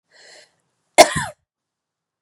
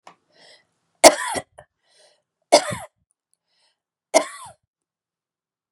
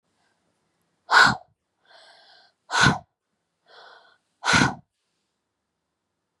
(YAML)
cough_length: 2.2 s
cough_amplitude: 32768
cough_signal_mean_std_ratio: 0.19
three_cough_length: 5.7 s
three_cough_amplitude: 32768
three_cough_signal_mean_std_ratio: 0.2
exhalation_length: 6.4 s
exhalation_amplitude: 25318
exhalation_signal_mean_std_ratio: 0.27
survey_phase: beta (2021-08-13 to 2022-03-07)
age: 45-64
gender: Female
wearing_mask: 'No'
symptom_cough_any: true
symptom_runny_or_blocked_nose: true
symptom_fatigue: true
symptom_onset: 4 days
smoker_status: Never smoked
respiratory_condition_asthma: false
respiratory_condition_other: false
recruitment_source: Test and Trace
submission_delay: 1 day
covid_test_result: Positive
covid_test_method: RT-qPCR
covid_ct_value: 27.2
covid_ct_gene: ORF1ab gene